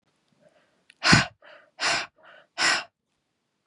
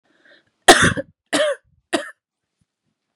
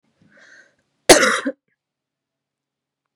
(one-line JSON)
{"exhalation_length": "3.7 s", "exhalation_amplitude": 28532, "exhalation_signal_mean_std_ratio": 0.33, "three_cough_length": "3.2 s", "three_cough_amplitude": 32768, "three_cough_signal_mean_std_ratio": 0.3, "cough_length": "3.2 s", "cough_amplitude": 32768, "cough_signal_mean_std_ratio": 0.23, "survey_phase": "beta (2021-08-13 to 2022-03-07)", "age": "18-44", "gender": "Female", "wearing_mask": "No", "symptom_cough_any": true, "symptom_new_continuous_cough": true, "symptom_runny_or_blocked_nose": true, "symptom_shortness_of_breath": true, "symptom_sore_throat": true, "symptom_abdominal_pain": true, "symptom_headache": true, "symptom_change_to_sense_of_smell_or_taste": true, "symptom_loss_of_taste": true, "symptom_onset": "4 days", "smoker_status": "Never smoked", "respiratory_condition_asthma": true, "respiratory_condition_other": false, "recruitment_source": "REACT", "submission_delay": "1 day", "covid_test_result": "Positive", "covid_test_method": "RT-qPCR", "covid_ct_value": 15.7, "covid_ct_gene": "E gene", "influenza_a_test_result": "Negative", "influenza_b_test_result": "Negative"}